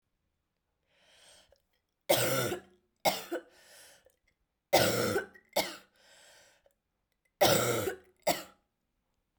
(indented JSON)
{
  "three_cough_length": "9.4 s",
  "three_cough_amplitude": 9141,
  "three_cough_signal_mean_std_ratio": 0.36,
  "survey_phase": "beta (2021-08-13 to 2022-03-07)",
  "age": "18-44",
  "gender": "Female",
  "wearing_mask": "No",
  "symptom_cough_any": true,
  "symptom_new_continuous_cough": true,
  "symptom_runny_or_blocked_nose": true,
  "symptom_sore_throat": true,
  "symptom_fatigue": true,
  "symptom_fever_high_temperature": true,
  "symptom_headache": true,
  "symptom_change_to_sense_of_smell_or_taste": true,
  "symptom_onset": "3 days",
  "smoker_status": "Never smoked",
  "respiratory_condition_asthma": false,
  "respiratory_condition_other": false,
  "recruitment_source": "Test and Trace",
  "submission_delay": "2 days",
  "covid_test_result": "Positive",
  "covid_test_method": "RT-qPCR",
  "covid_ct_value": 13.1,
  "covid_ct_gene": "S gene",
  "covid_ct_mean": 13.8,
  "covid_viral_load": "31000000 copies/ml",
  "covid_viral_load_category": "High viral load (>1M copies/ml)"
}